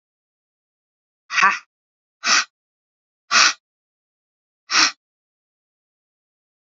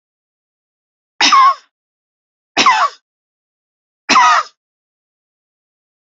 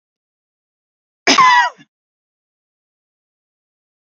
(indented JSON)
{
  "exhalation_length": "6.7 s",
  "exhalation_amplitude": 30343,
  "exhalation_signal_mean_std_ratio": 0.27,
  "three_cough_length": "6.1 s",
  "three_cough_amplitude": 32545,
  "three_cough_signal_mean_std_ratio": 0.34,
  "cough_length": "4.1 s",
  "cough_amplitude": 32768,
  "cough_signal_mean_std_ratio": 0.26,
  "survey_phase": "beta (2021-08-13 to 2022-03-07)",
  "age": "45-64",
  "gender": "Female",
  "wearing_mask": "No",
  "symptom_headache": true,
  "symptom_onset": "9 days",
  "smoker_status": "Never smoked",
  "respiratory_condition_asthma": false,
  "respiratory_condition_other": false,
  "recruitment_source": "REACT",
  "submission_delay": "0 days",
  "covid_test_result": "Negative",
  "covid_test_method": "RT-qPCR"
}